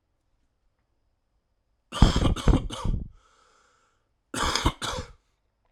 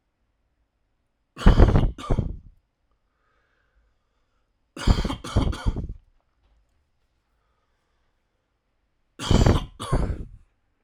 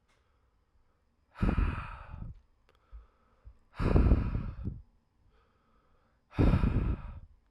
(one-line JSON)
{"cough_length": "5.7 s", "cough_amplitude": 29639, "cough_signal_mean_std_ratio": 0.35, "three_cough_length": "10.8 s", "three_cough_amplitude": 32767, "three_cough_signal_mean_std_ratio": 0.32, "exhalation_length": "7.5 s", "exhalation_amplitude": 7385, "exhalation_signal_mean_std_ratio": 0.42, "survey_phase": "alpha (2021-03-01 to 2021-08-12)", "age": "18-44", "gender": "Male", "wearing_mask": "No", "symptom_new_continuous_cough": true, "symptom_fatigue": true, "symptom_fever_high_temperature": true, "symptom_loss_of_taste": true, "symptom_onset": "4 days", "smoker_status": "Never smoked", "respiratory_condition_asthma": false, "respiratory_condition_other": false, "recruitment_source": "Test and Trace", "submission_delay": "2 days", "covid_test_result": "Positive", "covid_test_method": "RT-qPCR", "covid_ct_value": 18.3, "covid_ct_gene": "ORF1ab gene", "covid_ct_mean": 19.3, "covid_viral_load": "460000 copies/ml", "covid_viral_load_category": "Low viral load (10K-1M copies/ml)"}